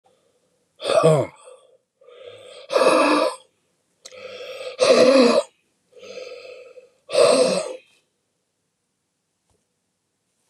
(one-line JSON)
{"exhalation_length": "10.5 s", "exhalation_amplitude": 25427, "exhalation_signal_mean_std_ratio": 0.41, "survey_phase": "beta (2021-08-13 to 2022-03-07)", "age": "65+", "gender": "Male", "wearing_mask": "No", "symptom_cough_any": true, "symptom_shortness_of_breath": true, "symptom_onset": "12 days", "smoker_status": "Ex-smoker", "respiratory_condition_asthma": false, "respiratory_condition_other": true, "recruitment_source": "REACT", "submission_delay": "0 days", "covid_test_result": "Negative", "covid_test_method": "RT-qPCR", "influenza_a_test_result": "Negative", "influenza_b_test_result": "Negative"}